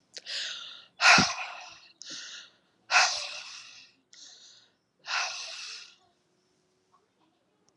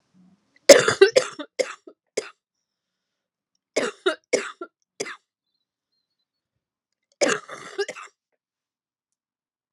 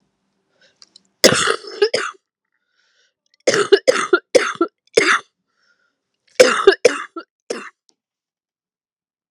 exhalation_length: 7.8 s
exhalation_amplitude: 23922
exhalation_signal_mean_std_ratio: 0.33
three_cough_length: 9.7 s
three_cough_amplitude: 32768
three_cough_signal_mean_std_ratio: 0.22
cough_length: 9.3 s
cough_amplitude: 32768
cough_signal_mean_std_ratio: 0.33
survey_phase: alpha (2021-03-01 to 2021-08-12)
age: 18-44
gender: Female
wearing_mask: 'No'
symptom_cough_any: true
symptom_new_continuous_cough: true
symptom_shortness_of_breath: true
symptom_diarrhoea: true
symptom_fatigue: true
symptom_headache: true
symptom_change_to_sense_of_smell_or_taste: true
symptom_loss_of_taste: true
symptom_onset: 6 days
smoker_status: Never smoked
respiratory_condition_asthma: false
respiratory_condition_other: false
recruitment_source: Test and Trace
submission_delay: 2 days
covid_test_result: Positive
covid_test_method: RT-qPCR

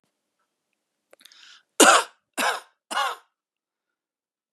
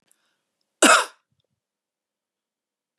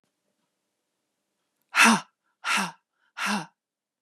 three_cough_length: 4.5 s
three_cough_amplitude: 31410
three_cough_signal_mean_std_ratio: 0.26
cough_length: 3.0 s
cough_amplitude: 28935
cough_signal_mean_std_ratio: 0.21
exhalation_length: 4.0 s
exhalation_amplitude: 19170
exhalation_signal_mean_std_ratio: 0.3
survey_phase: beta (2021-08-13 to 2022-03-07)
age: 45-64
gender: Female
wearing_mask: 'No'
symptom_none: true
smoker_status: Ex-smoker
respiratory_condition_asthma: false
respiratory_condition_other: false
recruitment_source: REACT
submission_delay: 1 day
covid_test_result: Negative
covid_test_method: RT-qPCR
influenza_a_test_result: Negative
influenza_b_test_result: Negative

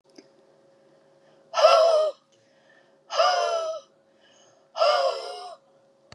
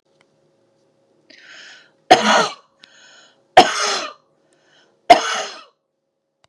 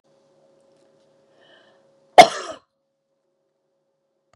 exhalation_length: 6.1 s
exhalation_amplitude: 20787
exhalation_signal_mean_std_ratio: 0.44
three_cough_length: 6.5 s
three_cough_amplitude: 32768
three_cough_signal_mean_std_ratio: 0.28
cough_length: 4.4 s
cough_amplitude: 32768
cough_signal_mean_std_ratio: 0.13
survey_phase: beta (2021-08-13 to 2022-03-07)
age: 45-64
gender: Female
wearing_mask: 'No'
symptom_none: true
smoker_status: Ex-smoker
respiratory_condition_asthma: false
respiratory_condition_other: false
recruitment_source: REACT
submission_delay: 3 days
covid_test_result: Negative
covid_test_method: RT-qPCR
influenza_a_test_result: Unknown/Void
influenza_b_test_result: Unknown/Void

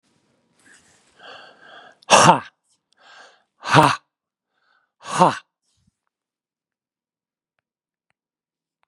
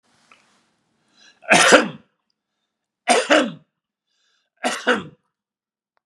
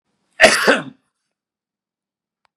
exhalation_length: 8.9 s
exhalation_amplitude: 32768
exhalation_signal_mean_std_ratio: 0.22
three_cough_length: 6.1 s
three_cough_amplitude: 32768
three_cough_signal_mean_std_ratio: 0.31
cough_length: 2.6 s
cough_amplitude: 32768
cough_signal_mean_std_ratio: 0.28
survey_phase: beta (2021-08-13 to 2022-03-07)
age: 65+
gender: Male
wearing_mask: 'No'
symptom_none: true
smoker_status: Never smoked
respiratory_condition_asthma: false
respiratory_condition_other: false
recruitment_source: REACT
submission_delay: 4 days
covid_test_result: Negative
covid_test_method: RT-qPCR
influenza_a_test_result: Negative
influenza_b_test_result: Negative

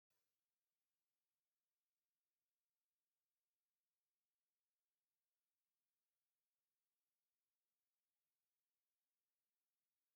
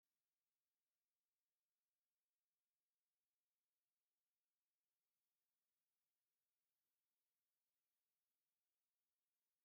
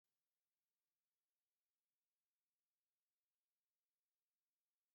three_cough_length: 10.2 s
three_cough_amplitude: 6
three_cough_signal_mean_std_ratio: 0.41
exhalation_length: 9.6 s
exhalation_amplitude: 3
exhalation_signal_mean_std_ratio: 0.43
cough_length: 4.9 s
cough_amplitude: 3
cough_signal_mean_std_ratio: 0.36
survey_phase: beta (2021-08-13 to 2022-03-07)
age: 65+
gender: Male
wearing_mask: 'No'
symptom_none: true
smoker_status: Ex-smoker
respiratory_condition_asthma: false
respiratory_condition_other: false
recruitment_source: REACT
submission_delay: 2 days
covid_test_result: Negative
covid_test_method: RT-qPCR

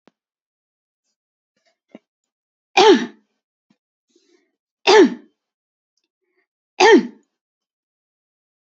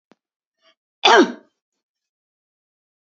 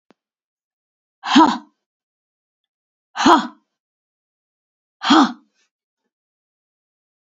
three_cough_length: 8.8 s
three_cough_amplitude: 29577
three_cough_signal_mean_std_ratio: 0.24
cough_length: 3.1 s
cough_amplitude: 29586
cough_signal_mean_std_ratio: 0.22
exhalation_length: 7.3 s
exhalation_amplitude: 28326
exhalation_signal_mean_std_ratio: 0.25
survey_phase: beta (2021-08-13 to 2022-03-07)
age: 45-64
gender: Female
wearing_mask: 'No'
symptom_none: true
smoker_status: Never smoked
respiratory_condition_asthma: true
respiratory_condition_other: false
recruitment_source: Test and Trace
submission_delay: 2 days
covid_test_result: Negative
covid_test_method: RT-qPCR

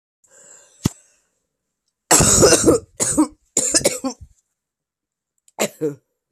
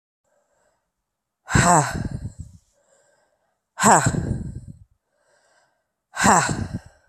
cough_length: 6.3 s
cough_amplitude: 32768
cough_signal_mean_std_ratio: 0.39
exhalation_length: 7.1 s
exhalation_amplitude: 27035
exhalation_signal_mean_std_ratio: 0.37
survey_phase: alpha (2021-03-01 to 2021-08-12)
age: 18-44
gender: Female
wearing_mask: 'No'
symptom_cough_any: true
symptom_new_continuous_cough: true
symptom_shortness_of_breath: true
symptom_fatigue: true
symptom_headache: true
symptom_change_to_sense_of_smell_or_taste: true
symptom_loss_of_taste: true
symptom_onset: 4 days
smoker_status: Never smoked
respiratory_condition_asthma: false
respiratory_condition_other: false
recruitment_source: Test and Trace
submission_delay: 1 day
covid_test_result: Positive
covid_test_method: RT-qPCR
covid_ct_value: 18.3
covid_ct_gene: ORF1ab gene
covid_ct_mean: 19.2
covid_viral_load: 510000 copies/ml
covid_viral_load_category: Low viral load (10K-1M copies/ml)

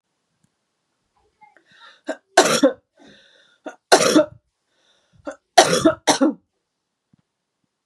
three_cough_length: 7.9 s
three_cough_amplitude: 32768
three_cough_signal_mean_std_ratio: 0.3
survey_phase: beta (2021-08-13 to 2022-03-07)
age: 45-64
gender: Female
wearing_mask: 'No'
symptom_none: true
symptom_onset: 11 days
smoker_status: Never smoked
respiratory_condition_asthma: false
respiratory_condition_other: false
recruitment_source: REACT
submission_delay: 1 day
covid_test_result: Negative
covid_test_method: RT-qPCR
influenza_a_test_result: Negative
influenza_b_test_result: Negative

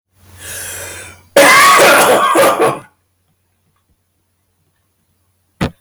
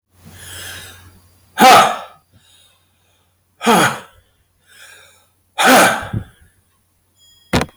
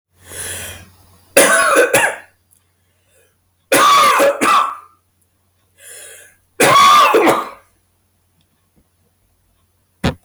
cough_length: 5.8 s
cough_amplitude: 32768
cough_signal_mean_std_ratio: 0.5
exhalation_length: 7.8 s
exhalation_amplitude: 32766
exhalation_signal_mean_std_ratio: 0.36
three_cough_length: 10.2 s
three_cough_amplitude: 32768
three_cough_signal_mean_std_ratio: 0.49
survey_phase: beta (2021-08-13 to 2022-03-07)
age: 65+
gender: Male
wearing_mask: 'No'
symptom_cough_any: true
symptom_runny_or_blocked_nose: true
smoker_status: Never smoked
respiratory_condition_asthma: true
respiratory_condition_other: false
recruitment_source: Test and Trace
submission_delay: 1 day
covid_test_result: Positive
covid_test_method: RT-qPCR
covid_ct_value: 19.3
covid_ct_gene: ORF1ab gene
covid_ct_mean: 19.6
covid_viral_load: 360000 copies/ml
covid_viral_load_category: Low viral load (10K-1M copies/ml)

